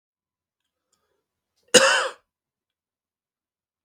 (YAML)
cough_length: 3.8 s
cough_amplitude: 32768
cough_signal_mean_std_ratio: 0.21
survey_phase: beta (2021-08-13 to 2022-03-07)
age: 45-64
gender: Male
wearing_mask: 'No'
symptom_cough_any: true
symptom_runny_or_blocked_nose: true
symptom_fatigue: true
symptom_fever_high_temperature: true
symptom_change_to_sense_of_smell_or_taste: true
symptom_loss_of_taste: true
symptom_onset: 4 days
smoker_status: Never smoked
respiratory_condition_asthma: false
respiratory_condition_other: false
recruitment_source: Test and Trace
submission_delay: 2 days
covid_test_result: Positive
covid_test_method: LAMP